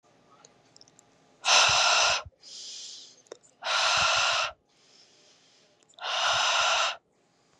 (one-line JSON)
{"exhalation_length": "7.6 s", "exhalation_amplitude": 13010, "exhalation_signal_mean_std_ratio": 0.52, "survey_phase": "beta (2021-08-13 to 2022-03-07)", "age": "18-44", "gender": "Female", "wearing_mask": "No", "symptom_runny_or_blocked_nose": true, "symptom_fatigue": true, "symptom_loss_of_taste": true, "symptom_other": true, "symptom_onset": "7 days", "smoker_status": "Never smoked", "respiratory_condition_asthma": false, "respiratory_condition_other": false, "recruitment_source": "REACT", "submission_delay": "1 day", "covid_test_result": "Positive", "covid_test_method": "RT-qPCR", "covid_ct_value": 18.6, "covid_ct_gene": "E gene", "influenza_a_test_result": "Negative", "influenza_b_test_result": "Negative"}